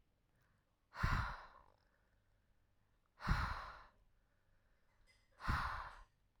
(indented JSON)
{
  "exhalation_length": "6.4 s",
  "exhalation_amplitude": 2338,
  "exhalation_signal_mean_std_ratio": 0.37,
  "survey_phase": "alpha (2021-03-01 to 2021-08-12)",
  "age": "18-44",
  "gender": "Female",
  "wearing_mask": "No",
  "symptom_none": true,
  "smoker_status": "Current smoker (11 or more cigarettes per day)",
  "respiratory_condition_asthma": true,
  "respiratory_condition_other": false,
  "recruitment_source": "REACT",
  "submission_delay": "1 day",
  "covid_test_result": "Negative",
  "covid_test_method": "RT-qPCR"
}